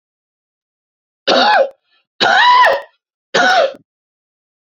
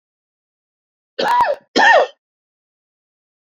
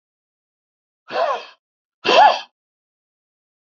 {
  "three_cough_length": "4.6 s",
  "three_cough_amplitude": 31590,
  "three_cough_signal_mean_std_ratio": 0.48,
  "cough_length": "3.5 s",
  "cough_amplitude": 29748,
  "cough_signal_mean_std_ratio": 0.36,
  "exhalation_length": "3.7 s",
  "exhalation_amplitude": 28113,
  "exhalation_signal_mean_std_ratio": 0.3,
  "survey_phase": "beta (2021-08-13 to 2022-03-07)",
  "age": "45-64",
  "gender": "Male",
  "wearing_mask": "No",
  "symptom_cough_any": true,
  "symptom_runny_or_blocked_nose": true,
  "symptom_shortness_of_breath": true,
  "symptom_sore_throat": true,
  "symptom_fatigue": true,
  "symptom_headache": true,
  "smoker_status": "Never smoked",
  "respiratory_condition_asthma": false,
  "respiratory_condition_other": false,
  "recruitment_source": "Test and Trace",
  "submission_delay": "0 days",
  "covid_test_result": "Positive",
  "covid_test_method": "LFT"
}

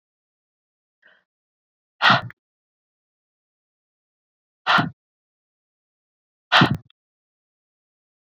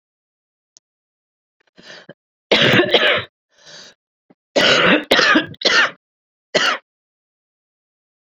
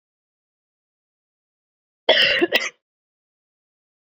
{
  "exhalation_length": "8.4 s",
  "exhalation_amplitude": 27224,
  "exhalation_signal_mean_std_ratio": 0.21,
  "three_cough_length": "8.4 s",
  "three_cough_amplitude": 32210,
  "three_cough_signal_mean_std_ratio": 0.4,
  "cough_length": "4.1 s",
  "cough_amplitude": 28979,
  "cough_signal_mean_std_ratio": 0.27,
  "survey_phase": "beta (2021-08-13 to 2022-03-07)",
  "age": "45-64",
  "gender": "Female",
  "wearing_mask": "No",
  "symptom_cough_any": true,
  "symptom_shortness_of_breath": true,
  "symptom_sore_throat": true,
  "symptom_diarrhoea": true,
  "symptom_fatigue": true,
  "symptom_headache": true,
  "symptom_change_to_sense_of_smell_or_taste": true,
  "symptom_onset": "6 days",
  "smoker_status": "Current smoker (1 to 10 cigarettes per day)",
  "respiratory_condition_asthma": false,
  "respiratory_condition_other": false,
  "recruitment_source": "Test and Trace",
  "submission_delay": "1 day",
  "covid_test_result": "Positive",
  "covid_test_method": "RT-qPCR",
  "covid_ct_value": 25.5,
  "covid_ct_gene": "ORF1ab gene"
}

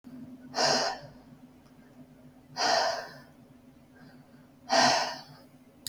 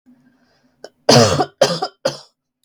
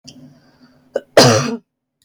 {
  "exhalation_length": "5.9 s",
  "exhalation_amplitude": 9208,
  "exhalation_signal_mean_std_ratio": 0.45,
  "three_cough_length": "2.6 s",
  "three_cough_amplitude": 32768,
  "three_cough_signal_mean_std_ratio": 0.38,
  "cough_length": "2.0 s",
  "cough_amplitude": 32768,
  "cough_signal_mean_std_ratio": 0.35,
  "survey_phase": "beta (2021-08-13 to 2022-03-07)",
  "age": "18-44",
  "gender": "Female",
  "wearing_mask": "No",
  "symptom_none": true,
  "symptom_onset": "6 days",
  "smoker_status": "Never smoked",
  "respiratory_condition_asthma": false,
  "respiratory_condition_other": false,
  "recruitment_source": "REACT",
  "submission_delay": "3 days",
  "covid_test_result": "Negative",
  "covid_test_method": "RT-qPCR"
}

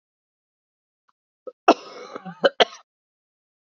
{
  "cough_length": "3.8 s",
  "cough_amplitude": 27833,
  "cough_signal_mean_std_ratio": 0.18,
  "survey_phase": "beta (2021-08-13 to 2022-03-07)",
  "age": "18-44",
  "gender": "Female",
  "wearing_mask": "No",
  "symptom_cough_any": true,
  "symptom_new_continuous_cough": true,
  "symptom_runny_or_blocked_nose": true,
  "symptom_shortness_of_breath": true,
  "symptom_sore_throat": true,
  "symptom_fatigue": true,
  "symptom_fever_high_temperature": true,
  "symptom_headache": true,
  "symptom_onset": "3 days",
  "smoker_status": "Ex-smoker",
  "respiratory_condition_asthma": false,
  "respiratory_condition_other": false,
  "recruitment_source": "Test and Trace",
  "submission_delay": "1 day",
  "covid_test_result": "Positive",
  "covid_test_method": "RT-qPCR",
  "covid_ct_value": 21.4,
  "covid_ct_gene": "ORF1ab gene",
  "covid_ct_mean": 22.0,
  "covid_viral_load": "59000 copies/ml",
  "covid_viral_load_category": "Low viral load (10K-1M copies/ml)"
}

